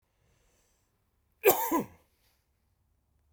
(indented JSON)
{
  "cough_length": "3.3 s",
  "cough_amplitude": 14842,
  "cough_signal_mean_std_ratio": 0.24,
  "survey_phase": "beta (2021-08-13 to 2022-03-07)",
  "age": "65+",
  "gender": "Male",
  "wearing_mask": "No",
  "symptom_none": true,
  "smoker_status": "Ex-smoker",
  "respiratory_condition_asthma": false,
  "respiratory_condition_other": false,
  "recruitment_source": "REACT",
  "submission_delay": "1 day",
  "covid_test_result": "Negative",
  "covid_test_method": "RT-qPCR"
}